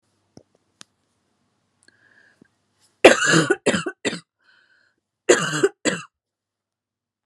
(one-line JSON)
{"cough_length": "7.3 s", "cough_amplitude": 32768, "cough_signal_mean_std_ratio": 0.28, "survey_phase": "beta (2021-08-13 to 2022-03-07)", "age": "18-44", "gender": "Female", "wearing_mask": "No", "symptom_cough_any": true, "symptom_runny_or_blocked_nose": true, "symptom_change_to_sense_of_smell_or_taste": true, "symptom_loss_of_taste": true, "symptom_onset": "7 days", "smoker_status": "Never smoked", "respiratory_condition_asthma": false, "respiratory_condition_other": false, "recruitment_source": "Test and Trace", "submission_delay": "2 days", "covid_test_result": "Positive", "covid_test_method": "RT-qPCR"}